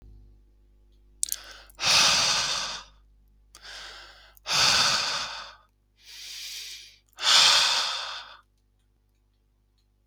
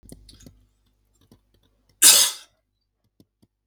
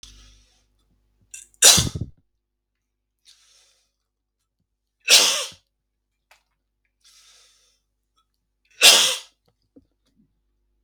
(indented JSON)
{
  "exhalation_length": "10.1 s",
  "exhalation_amplitude": 19893,
  "exhalation_signal_mean_std_ratio": 0.45,
  "cough_length": "3.7 s",
  "cough_amplitude": 32768,
  "cough_signal_mean_std_ratio": 0.22,
  "three_cough_length": "10.8 s",
  "three_cough_amplitude": 32768,
  "three_cough_signal_mean_std_ratio": 0.23,
  "survey_phase": "beta (2021-08-13 to 2022-03-07)",
  "age": "18-44",
  "gender": "Male",
  "wearing_mask": "No",
  "symptom_none": true,
  "smoker_status": "Never smoked",
  "respiratory_condition_asthma": false,
  "respiratory_condition_other": false,
  "recruitment_source": "REACT",
  "submission_delay": "3 days",
  "covid_test_result": "Negative",
  "covid_test_method": "RT-qPCR",
  "influenza_a_test_result": "Negative",
  "influenza_b_test_result": "Negative"
}